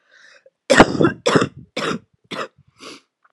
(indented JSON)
{
  "cough_length": "3.3 s",
  "cough_amplitude": 32768,
  "cough_signal_mean_std_ratio": 0.36,
  "survey_phase": "beta (2021-08-13 to 2022-03-07)",
  "age": "18-44",
  "gender": "Female",
  "wearing_mask": "No",
  "symptom_cough_any": true,
  "symptom_shortness_of_breath": true,
  "symptom_sore_throat": true,
  "symptom_fatigue": true,
  "symptom_fever_high_temperature": true,
  "symptom_headache": true,
  "symptom_onset": "3 days",
  "smoker_status": "Prefer not to say",
  "respiratory_condition_asthma": true,
  "respiratory_condition_other": false,
  "recruitment_source": "Test and Trace",
  "submission_delay": "2 days",
  "covid_test_result": "Negative",
  "covid_test_method": "RT-qPCR"
}